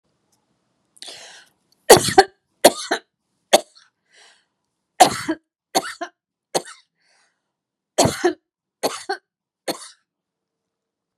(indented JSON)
{
  "three_cough_length": "11.2 s",
  "three_cough_amplitude": 32768,
  "three_cough_signal_mean_std_ratio": 0.23,
  "survey_phase": "beta (2021-08-13 to 2022-03-07)",
  "age": "65+",
  "gender": "Female",
  "wearing_mask": "No",
  "symptom_none": true,
  "smoker_status": "Never smoked",
  "respiratory_condition_asthma": false,
  "respiratory_condition_other": false,
  "recruitment_source": "REACT",
  "submission_delay": "1 day",
  "covid_test_result": "Negative",
  "covid_test_method": "RT-qPCR"
}